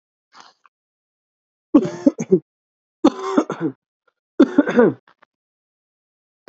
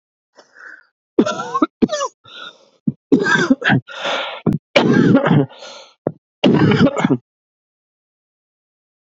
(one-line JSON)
{"three_cough_length": "6.5 s", "three_cough_amplitude": 29723, "three_cough_signal_mean_std_ratio": 0.3, "cough_length": "9.0 s", "cough_amplitude": 29654, "cough_signal_mean_std_ratio": 0.47, "survey_phase": "beta (2021-08-13 to 2022-03-07)", "age": "18-44", "gender": "Male", "wearing_mask": "No", "symptom_fatigue": true, "symptom_headache": true, "symptom_onset": "5 days", "smoker_status": "Ex-smoker", "respiratory_condition_asthma": false, "respiratory_condition_other": false, "recruitment_source": "Test and Trace", "submission_delay": "2 days", "covid_test_result": "Positive", "covid_test_method": "RT-qPCR", "covid_ct_value": 14.8, "covid_ct_gene": "ORF1ab gene", "covid_ct_mean": 15.1, "covid_viral_load": "11000000 copies/ml", "covid_viral_load_category": "High viral load (>1M copies/ml)"}